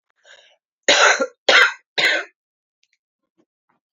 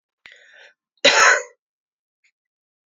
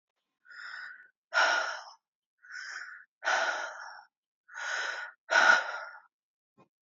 {
  "three_cough_length": "3.9 s",
  "three_cough_amplitude": 32767,
  "three_cough_signal_mean_std_ratio": 0.37,
  "cough_length": "2.9 s",
  "cough_amplitude": 30399,
  "cough_signal_mean_std_ratio": 0.29,
  "exhalation_length": "6.8 s",
  "exhalation_amplitude": 10971,
  "exhalation_signal_mean_std_ratio": 0.42,
  "survey_phase": "alpha (2021-03-01 to 2021-08-12)",
  "age": "18-44",
  "gender": "Female",
  "wearing_mask": "No",
  "symptom_cough_any": true,
  "symptom_shortness_of_breath": true,
  "symptom_fatigue": true,
  "symptom_headache": true,
  "symptom_change_to_sense_of_smell_or_taste": true,
  "symptom_loss_of_taste": true,
  "symptom_onset": "3 days",
  "smoker_status": "Current smoker (11 or more cigarettes per day)",
  "respiratory_condition_asthma": false,
  "respiratory_condition_other": false,
  "recruitment_source": "Test and Trace",
  "submission_delay": "2 days",
  "covid_test_result": "Positive",
  "covid_test_method": "RT-qPCR",
  "covid_ct_value": 16.0,
  "covid_ct_gene": "N gene",
  "covid_ct_mean": 16.9,
  "covid_viral_load": "2900000 copies/ml",
  "covid_viral_load_category": "High viral load (>1M copies/ml)"
}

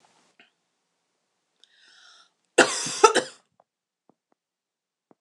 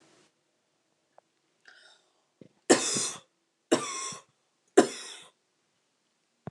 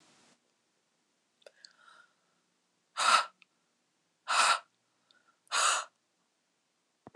{
  "cough_length": "5.2 s",
  "cough_amplitude": 26027,
  "cough_signal_mean_std_ratio": 0.2,
  "three_cough_length": "6.5 s",
  "three_cough_amplitude": 20014,
  "three_cough_signal_mean_std_ratio": 0.24,
  "exhalation_length": "7.2 s",
  "exhalation_amplitude": 9895,
  "exhalation_signal_mean_std_ratio": 0.28,
  "survey_phase": "beta (2021-08-13 to 2022-03-07)",
  "age": "18-44",
  "gender": "Female",
  "wearing_mask": "No",
  "symptom_cough_any": true,
  "symptom_runny_or_blocked_nose": true,
  "symptom_shortness_of_breath": true,
  "symptom_sore_throat": true,
  "symptom_fever_high_temperature": true,
  "symptom_onset": "2 days",
  "smoker_status": "Never smoked",
  "respiratory_condition_asthma": true,
  "respiratory_condition_other": false,
  "recruitment_source": "Test and Trace",
  "submission_delay": "2 days",
  "covid_test_result": "Positive",
  "covid_test_method": "RT-qPCR",
  "covid_ct_value": 25.0,
  "covid_ct_gene": "N gene"
}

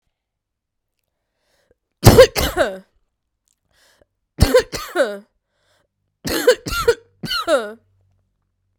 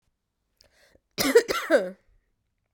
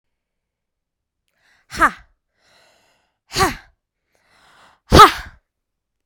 {
  "three_cough_length": "8.8 s",
  "three_cough_amplitude": 32768,
  "three_cough_signal_mean_std_ratio": 0.31,
  "cough_length": "2.7 s",
  "cough_amplitude": 17944,
  "cough_signal_mean_std_ratio": 0.32,
  "exhalation_length": "6.1 s",
  "exhalation_amplitude": 32768,
  "exhalation_signal_mean_std_ratio": 0.2,
  "survey_phase": "beta (2021-08-13 to 2022-03-07)",
  "age": "18-44",
  "gender": "Female",
  "wearing_mask": "No",
  "symptom_cough_any": true,
  "symptom_runny_or_blocked_nose": true,
  "symptom_sore_throat": true,
  "symptom_fatigue": true,
  "symptom_fever_high_temperature": true,
  "symptom_headache": true,
  "smoker_status": "Never smoked",
  "respiratory_condition_asthma": false,
  "respiratory_condition_other": false,
  "recruitment_source": "Test and Trace",
  "submission_delay": "1 day",
  "covid_test_result": "Positive",
  "covid_test_method": "LAMP"
}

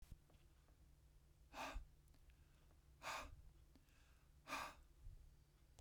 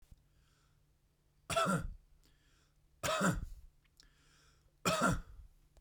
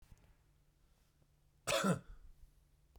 {
  "exhalation_length": "5.8 s",
  "exhalation_amplitude": 498,
  "exhalation_signal_mean_std_ratio": 0.56,
  "three_cough_length": "5.8 s",
  "three_cough_amplitude": 4510,
  "three_cough_signal_mean_std_ratio": 0.4,
  "cough_length": "3.0 s",
  "cough_amplitude": 2754,
  "cough_signal_mean_std_ratio": 0.31,
  "survey_phase": "beta (2021-08-13 to 2022-03-07)",
  "age": "45-64",
  "gender": "Male",
  "wearing_mask": "No",
  "symptom_none": true,
  "smoker_status": "Never smoked",
  "respiratory_condition_asthma": true,
  "respiratory_condition_other": false,
  "recruitment_source": "REACT",
  "submission_delay": "0 days",
  "covid_test_result": "Negative",
  "covid_test_method": "RT-qPCR"
}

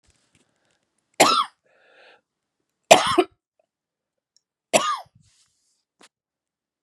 {
  "three_cough_length": "6.8 s",
  "three_cough_amplitude": 32768,
  "three_cough_signal_mean_std_ratio": 0.23,
  "survey_phase": "beta (2021-08-13 to 2022-03-07)",
  "age": "45-64",
  "gender": "Female",
  "wearing_mask": "No",
  "symptom_cough_any": true,
  "symptom_runny_or_blocked_nose": true,
  "symptom_fatigue": true,
  "symptom_fever_high_temperature": true,
  "symptom_headache": true,
  "symptom_change_to_sense_of_smell_or_taste": true,
  "symptom_onset": "4 days",
  "smoker_status": "Never smoked",
  "respiratory_condition_asthma": false,
  "respiratory_condition_other": false,
  "recruitment_source": "Test and Trace",
  "submission_delay": "2 days",
  "covid_test_result": "Positive",
  "covid_test_method": "RT-qPCR",
  "covid_ct_value": 15.4,
  "covid_ct_gene": "ORF1ab gene",
  "covid_ct_mean": 15.7,
  "covid_viral_load": "7200000 copies/ml",
  "covid_viral_load_category": "High viral load (>1M copies/ml)"
}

